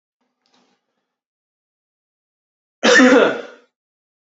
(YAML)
cough_length: 4.3 s
cough_amplitude: 29850
cough_signal_mean_std_ratio: 0.29
survey_phase: beta (2021-08-13 to 2022-03-07)
age: 18-44
gender: Male
wearing_mask: 'No'
symptom_cough_any: true
symptom_runny_or_blocked_nose: true
symptom_fatigue: true
symptom_change_to_sense_of_smell_or_taste: true
symptom_loss_of_taste: true
smoker_status: Never smoked
respiratory_condition_asthma: false
respiratory_condition_other: false
recruitment_source: Test and Trace
submission_delay: -1 day
covid_test_result: Positive
covid_test_method: LFT